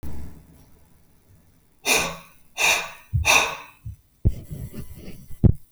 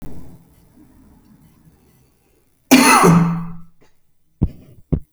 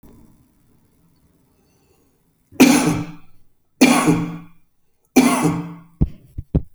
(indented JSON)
{
  "exhalation_length": "5.7 s",
  "exhalation_amplitude": 26509,
  "exhalation_signal_mean_std_ratio": 0.45,
  "cough_length": "5.1 s",
  "cough_amplitude": 32768,
  "cough_signal_mean_std_ratio": 0.37,
  "three_cough_length": "6.7 s",
  "three_cough_amplitude": 31468,
  "three_cough_signal_mean_std_ratio": 0.39,
  "survey_phase": "beta (2021-08-13 to 2022-03-07)",
  "age": "45-64",
  "gender": "Male",
  "wearing_mask": "No",
  "symptom_none": true,
  "smoker_status": "Current smoker (e-cigarettes or vapes only)",
  "respiratory_condition_asthma": false,
  "respiratory_condition_other": false,
  "recruitment_source": "REACT",
  "submission_delay": "1 day",
  "covid_test_result": "Negative",
  "covid_test_method": "RT-qPCR"
}